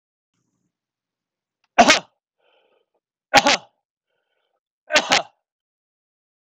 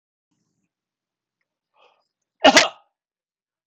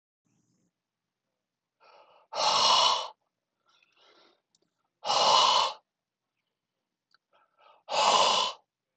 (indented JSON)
{
  "three_cough_length": "6.5 s",
  "three_cough_amplitude": 26028,
  "three_cough_signal_mean_std_ratio": 0.23,
  "cough_length": "3.7 s",
  "cough_amplitude": 26028,
  "cough_signal_mean_std_ratio": 0.18,
  "exhalation_length": "9.0 s",
  "exhalation_amplitude": 11688,
  "exhalation_signal_mean_std_ratio": 0.39,
  "survey_phase": "alpha (2021-03-01 to 2021-08-12)",
  "age": "45-64",
  "gender": "Male",
  "wearing_mask": "No",
  "symptom_fatigue": true,
  "smoker_status": "Ex-smoker",
  "respiratory_condition_asthma": false,
  "respiratory_condition_other": false,
  "recruitment_source": "Test and Trace",
  "submission_delay": "2 days",
  "covid_test_result": "Positive",
  "covid_test_method": "RT-qPCR",
  "covid_ct_value": 33.5,
  "covid_ct_gene": "N gene"
}